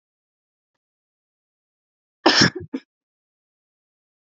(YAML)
cough_length: 4.4 s
cough_amplitude: 29022
cough_signal_mean_std_ratio: 0.2
survey_phase: beta (2021-08-13 to 2022-03-07)
age: 18-44
gender: Female
wearing_mask: 'No'
symptom_none: true
smoker_status: Never smoked
respiratory_condition_asthma: false
respiratory_condition_other: false
recruitment_source: REACT
submission_delay: 0 days
covid_test_result: Negative
covid_test_method: RT-qPCR
influenza_a_test_result: Negative
influenza_b_test_result: Negative